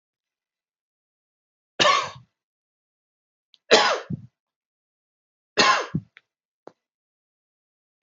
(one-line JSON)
{"three_cough_length": "8.0 s", "three_cough_amplitude": 27983, "three_cough_signal_mean_std_ratio": 0.26, "survey_phase": "beta (2021-08-13 to 2022-03-07)", "age": "65+", "gender": "Male", "wearing_mask": "No", "symptom_none": true, "symptom_onset": "2 days", "smoker_status": "Never smoked", "respiratory_condition_asthma": false, "respiratory_condition_other": false, "recruitment_source": "REACT", "submission_delay": "1 day", "covid_test_result": "Negative", "covid_test_method": "RT-qPCR"}